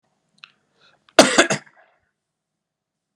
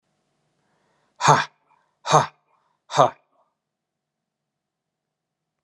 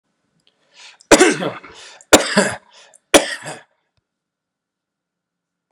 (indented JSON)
{
  "cough_length": "3.2 s",
  "cough_amplitude": 32768,
  "cough_signal_mean_std_ratio": 0.22,
  "exhalation_length": "5.6 s",
  "exhalation_amplitude": 30468,
  "exhalation_signal_mean_std_ratio": 0.22,
  "three_cough_length": "5.7 s",
  "three_cough_amplitude": 32768,
  "three_cough_signal_mean_std_ratio": 0.28,
  "survey_phase": "beta (2021-08-13 to 2022-03-07)",
  "age": "45-64",
  "gender": "Male",
  "wearing_mask": "No",
  "symptom_none": true,
  "smoker_status": "Never smoked",
  "respiratory_condition_asthma": false,
  "respiratory_condition_other": false,
  "recruitment_source": "Test and Trace",
  "submission_delay": "0 days",
  "covid_test_result": "Negative",
  "covid_test_method": "LFT"
}